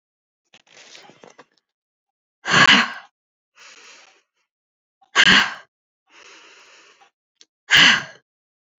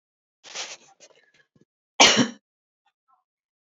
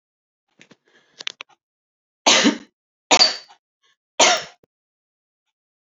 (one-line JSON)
{"exhalation_length": "8.8 s", "exhalation_amplitude": 32768, "exhalation_signal_mean_std_ratio": 0.28, "cough_length": "3.8 s", "cough_amplitude": 30933, "cough_signal_mean_std_ratio": 0.22, "three_cough_length": "5.9 s", "three_cough_amplitude": 31574, "three_cough_signal_mean_std_ratio": 0.27, "survey_phase": "beta (2021-08-13 to 2022-03-07)", "age": "18-44", "gender": "Female", "wearing_mask": "No", "symptom_none": true, "smoker_status": "Never smoked", "respiratory_condition_asthma": false, "respiratory_condition_other": false, "recruitment_source": "REACT", "submission_delay": "1 day", "covid_test_result": "Negative", "covid_test_method": "RT-qPCR"}